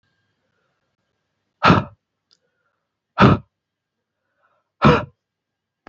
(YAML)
exhalation_length: 5.9 s
exhalation_amplitude: 32656
exhalation_signal_mean_std_ratio: 0.24
survey_phase: beta (2021-08-13 to 2022-03-07)
age: 18-44
gender: Male
wearing_mask: 'No'
symptom_none: true
smoker_status: Never smoked
respiratory_condition_asthma: false
respiratory_condition_other: false
recruitment_source: REACT
submission_delay: 3 days
covid_test_result: Negative
covid_test_method: RT-qPCR
influenza_a_test_result: Negative
influenza_b_test_result: Negative